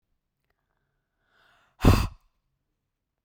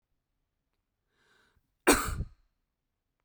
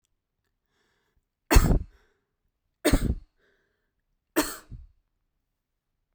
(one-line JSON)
{"exhalation_length": "3.2 s", "exhalation_amplitude": 19201, "exhalation_signal_mean_std_ratio": 0.2, "cough_length": "3.2 s", "cough_amplitude": 12632, "cough_signal_mean_std_ratio": 0.22, "three_cough_length": "6.1 s", "three_cough_amplitude": 22953, "three_cough_signal_mean_std_ratio": 0.25, "survey_phase": "beta (2021-08-13 to 2022-03-07)", "age": "18-44", "gender": "Female", "wearing_mask": "No", "symptom_none": true, "smoker_status": "Never smoked", "respiratory_condition_asthma": false, "respiratory_condition_other": false, "recruitment_source": "REACT", "submission_delay": "7 days", "covid_test_result": "Negative", "covid_test_method": "RT-qPCR", "influenza_a_test_result": "Negative", "influenza_b_test_result": "Negative"}